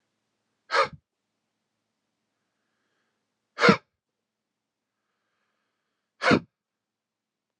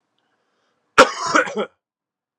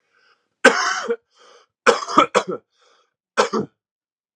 {
  "exhalation_length": "7.6 s",
  "exhalation_amplitude": 23713,
  "exhalation_signal_mean_std_ratio": 0.18,
  "cough_length": "2.4 s",
  "cough_amplitude": 32768,
  "cough_signal_mean_std_ratio": 0.29,
  "three_cough_length": "4.4 s",
  "three_cough_amplitude": 32768,
  "three_cough_signal_mean_std_ratio": 0.35,
  "survey_phase": "alpha (2021-03-01 to 2021-08-12)",
  "age": "18-44",
  "gender": "Male",
  "wearing_mask": "No",
  "symptom_new_continuous_cough": true,
  "symptom_shortness_of_breath": true,
  "symptom_fatigue": true,
  "symptom_headache": true,
  "symptom_change_to_sense_of_smell_or_taste": true,
  "symptom_loss_of_taste": true,
  "symptom_onset": "6 days",
  "smoker_status": "Never smoked",
  "respiratory_condition_asthma": true,
  "respiratory_condition_other": false,
  "recruitment_source": "Test and Trace",
  "submission_delay": "3 days",
  "covid_test_result": "Positive",
  "covid_test_method": "RT-qPCR",
  "covid_ct_value": 9.4,
  "covid_ct_gene": "N gene",
  "covid_ct_mean": 9.5,
  "covid_viral_load": "770000000 copies/ml",
  "covid_viral_load_category": "High viral load (>1M copies/ml)"
}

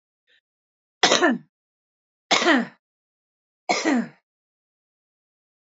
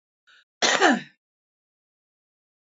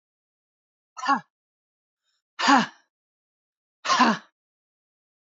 {
  "three_cough_length": "5.6 s",
  "three_cough_amplitude": 32767,
  "three_cough_signal_mean_std_ratio": 0.33,
  "cough_length": "2.7 s",
  "cough_amplitude": 29463,
  "cough_signal_mean_std_ratio": 0.28,
  "exhalation_length": "5.3 s",
  "exhalation_amplitude": 19768,
  "exhalation_signal_mean_std_ratio": 0.28,
  "survey_phase": "beta (2021-08-13 to 2022-03-07)",
  "age": "45-64",
  "gender": "Female",
  "wearing_mask": "No",
  "symptom_change_to_sense_of_smell_or_taste": true,
  "smoker_status": "Ex-smoker",
  "respiratory_condition_asthma": true,
  "respiratory_condition_other": false,
  "recruitment_source": "Test and Trace",
  "submission_delay": "0 days",
  "covid_test_result": "Negative",
  "covid_test_method": "LFT"
}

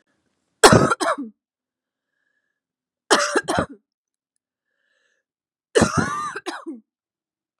{
  "three_cough_length": "7.6 s",
  "three_cough_amplitude": 32768,
  "three_cough_signal_mean_std_ratio": 0.31,
  "survey_phase": "beta (2021-08-13 to 2022-03-07)",
  "age": "18-44",
  "gender": "Female",
  "wearing_mask": "No",
  "symptom_runny_or_blocked_nose": true,
  "symptom_sore_throat": true,
  "symptom_headache": true,
  "smoker_status": "Never smoked",
  "respiratory_condition_asthma": false,
  "respiratory_condition_other": false,
  "recruitment_source": "Test and Trace",
  "submission_delay": "2 days",
  "covid_test_result": "Positive",
  "covid_test_method": "RT-qPCR"
}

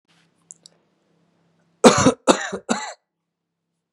{
  "three_cough_length": "3.9 s",
  "three_cough_amplitude": 32768,
  "three_cough_signal_mean_std_ratio": 0.26,
  "survey_phase": "beta (2021-08-13 to 2022-03-07)",
  "age": "18-44",
  "gender": "Male",
  "wearing_mask": "No",
  "symptom_sore_throat": true,
  "symptom_headache": true,
  "symptom_onset": "11 days",
  "smoker_status": "Never smoked",
  "respiratory_condition_asthma": false,
  "respiratory_condition_other": false,
  "recruitment_source": "REACT",
  "submission_delay": "2 days",
  "covid_test_result": "Negative",
  "covid_test_method": "RT-qPCR"
}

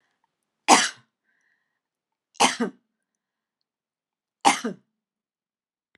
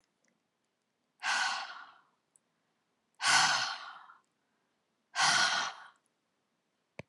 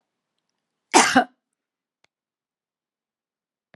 {
  "three_cough_length": "6.0 s",
  "three_cough_amplitude": 32013,
  "three_cough_signal_mean_std_ratio": 0.22,
  "exhalation_length": "7.1 s",
  "exhalation_amplitude": 8589,
  "exhalation_signal_mean_std_ratio": 0.38,
  "cough_length": "3.8 s",
  "cough_amplitude": 30273,
  "cough_signal_mean_std_ratio": 0.2,
  "survey_phase": "beta (2021-08-13 to 2022-03-07)",
  "age": "65+",
  "gender": "Female",
  "wearing_mask": "No",
  "symptom_none": true,
  "smoker_status": "Never smoked",
  "respiratory_condition_asthma": false,
  "respiratory_condition_other": false,
  "recruitment_source": "REACT",
  "submission_delay": "1 day",
  "covid_test_result": "Negative",
  "covid_test_method": "RT-qPCR",
  "influenza_a_test_result": "Negative",
  "influenza_b_test_result": "Negative"
}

